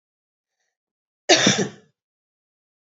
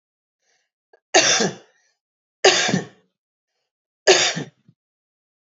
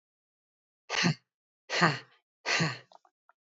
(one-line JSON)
{"cough_length": "3.0 s", "cough_amplitude": 28806, "cough_signal_mean_std_ratio": 0.26, "three_cough_length": "5.5 s", "three_cough_amplitude": 30341, "three_cough_signal_mean_std_ratio": 0.33, "exhalation_length": "3.4 s", "exhalation_amplitude": 14114, "exhalation_signal_mean_std_ratio": 0.37, "survey_phase": "beta (2021-08-13 to 2022-03-07)", "age": "45-64", "gender": "Female", "wearing_mask": "No", "symptom_cough_any": true, "symptom_runny_or_blocked_nose": true, "symptom_headache": true, "symptom_other": true, "smoker_status": "Never smoked", "respiratory_condition_asthma": false, "respiratory_condition_other": false, "recruitment_source": "Test and Trace", "submission_delay": "0 days", "covid_test_result": "Positive", "covid_test_method": "LFT"}